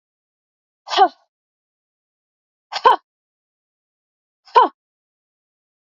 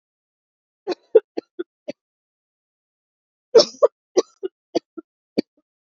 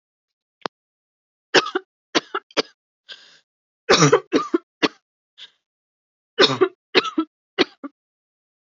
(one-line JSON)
{"exhalation_length": "5.9 s", "exhalation_amplitude": 29574, "exhalation_signal_mean_std_ratio": 0.21, "cough_length": "6.0 s", "cough_amplitude": 28110, "cough_signal_mean_std_ratio": 0.19, "three_cough_length": "8.6 s", "three_cough_amplitude": 32614, "three_cough_signal_mean_std_ratio": 0.29, "survey_phase": "alpha (2021-03-01 to 2021-08-12)", "age": "18-44", "gender": "Female", "wearing_mask": "No", "symptom_cough_any": true, "symptom_diarrhoea": true, "symptom_fatigue": true, "symptom_fever_high_temperature": true, "symptom_headache": true, "symptom_onset": "3 days", "smoker_status": "Never smoked", "respiratory_condition_asthma": false, "respiratory_condition_other": false, "recruitment_source": "Test and Trace", "submission_delay": "2 days", "covid_test_result": "Positive", "covid_test_method": "RT-qPCR", "covid_ct_value": 18.8, "covid_ct_gene": "ORF1ab gene", "covid_ct_mean": 19.2, "covid_viral_load": "510000 copies/ml", "covid_viral_load_category": "Low viral load (10K-1M copies/ml)"}